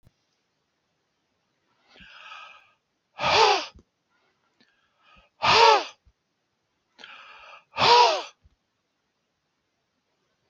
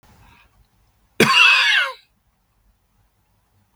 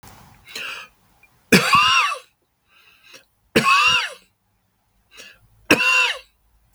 {"exhalation_length": "10.5 s", "exhalation_amplitude": 21424, "exhalation_signal_mean_std_ratio": 0.28, "cough_length": "3.8 s", "cough_amplitude": 32766, "cough_signal_mean_std_ratio": 0.36, "three_cough_length": "6.7 s", "three_cough_amplitude": 32768, "three_cough_signal_mean_std_ratio": 0.42, "survey_phase": "beta (2021-08-13 to 2022-03-07)", "age": "65+", "gender": "Male", "wearing_mask": "No", "symptom_runny_or_blocked_nose": true, "smoker_status": "Ex-smoker", "respiratory_condition_asthma": false, "respiratory_condition_other": false, "recruitment_source": "REACT", "submission_delay": "2 days", "covid_test_result": "Negative", "covid_test_method": "RT-qPCR"}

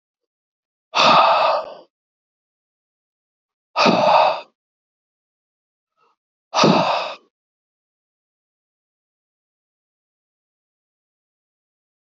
{"exhalation_length": "12.1 s", "exhalation_amplitude": 27049, "exhalation_signal_mean_std_ratio": 0.31, "survey_phase": "alpha (2021-03-01 to 2021-08-12)", "age": "65+", "gender": "Male", "wearing_mask": "No", "symptom_none": true, "smoker_status": "Never smoked", "respiratory_condition_asthma": false, "respiratory_condition_other": false, "recruitment_source": "REACT", "submission_delay": "1 day", "covid_test_result": "Negative", "covid_test_method": "RT-qPCR"}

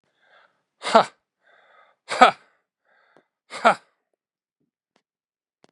{"exhalation_length": "5.7 s", "exhalation_amplitude": 32767, "exhalation_signal_mean_std_ratio": 0.19, "survey_phase": "beta (2021-08-13 to 2022-03-07)", "age": "45-64", "gender": "Male", "wearing_mask": "No", "symptom_none": true, "smoker_status": "Never smoked", "respiratory_condition_asthma": false, "respiratory_condition_other": false, "recruitment_source": "REACT", "submission_delay": "2 days", "covid_test_result": "Negative", "covid_test_method": "RT-qPCR", "influenza_a_test_result": "Negative", "influenza_b_test_result": "Negative"}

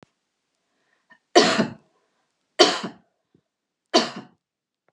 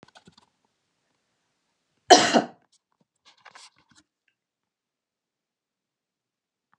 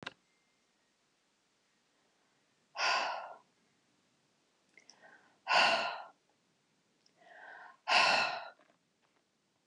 {"three_cough_length": "4.9 s", "three_cough_amplitude": 31859, "three_cough_signal_mean_std_ratio": 0.27, "cough_length": "6.8 s", "cough_amplitude": 32767, "cough_signal_mean_std_ratio": 0.15, "exhalation_length": "9.7 s", "exhalation_amplitude": 6568, "exhalation_signal_mean_std_ratio": 0.32, "survey_phase": "beta (2021-08-13 to 2022-03-07)", "age": "65+", "gender": "Female", "wearing_mask": "No", "symptom_none": true, "smoker_status": "Never smoked", "respiratory_condition_asthma": false, "respiratory_condition_other": false, "recruitment_source": "REACT", "submission_delay": "2 days", "covid_test_result": "Negative", "covid_test_method": "RT-qPCR"}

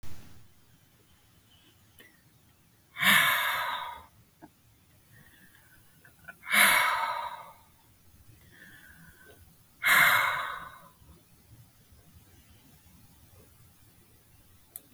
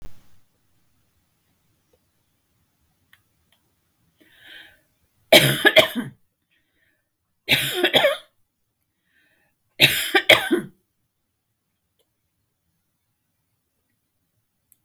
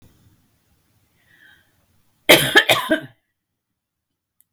{"exhalation_length": "14.9 s", "exhalation_amplitude": 12233, "exhalation_signal_mean_std_ratio": 0.35, "three_cough_length": "14.8 s", "three_cough_amplitude": 32768, "three_cough_signal_mean_std_ratio": 0.25, "cough_length": "4.5 s", "cough_amplitude": 32768, "cough_signal_mean_std_ratio": 0.25, "survey_phase": "beta (2021-08-13 to 2022-03-07)", "age": "65+", "gender": "Female", "wearing_mask": "No", "symptom_cough_any": true, "smoker_status": "Never smoked", "respiratory_condition_asthma": false, "respiratory_condition_other": false, "recruitment_source": "REACT", "submission_delay": "2 days", "covid_test_result": "Negative", "covid_test_method": "RT-qPCR", "influenza_a_test_result": "Unknown/Void", "influenza_b_test_result": "Unknown/Void"}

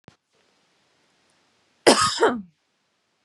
{"cough_length": "3.2 s", "cough_amplitude": 29733, "cough_signal_mean_std_ratio": 0.28, "survey_phase": "beta (2021-08-13 to 2022-03-07)", "age": "18-44", "gender": "Female", "wearing_mask": "No", "symptom_none": true, "smoker_status": "Never smoked", "respiratory_condition_asthma": false, "respiratory_condition_other": false, "recruitment_source": "REACT", "submission_delay": "3 days", "covid_test_result": "Negative", "covid_test_method": "RT-qPCR", "influenza_a_test_result": "Negative", "influenza_b_test_result": "Negative"}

